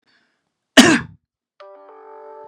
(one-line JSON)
{"cough_length": "2.5 s", "cough_amplitude": 32768, "cough_signal_mean_std_ratio": 0.26, "survey_phase": "beta (2021-08-13 to 2022-03-07)", "age": "45-64", "gender": "Male", "wearing_mask": "No", "symptom_none": true, "smoker_status": "Never smoked", "respiratory_condition_asthma": true, "respiratory_condition_other": false, "recruitment_source": "REACT", "submission_delay": "1 day", "covid_test_result": "Negative", "covid_test_method": "RT-qPCR", "influenza_a_test_result": "Negative", "influenza_b_test_result": "Negative"}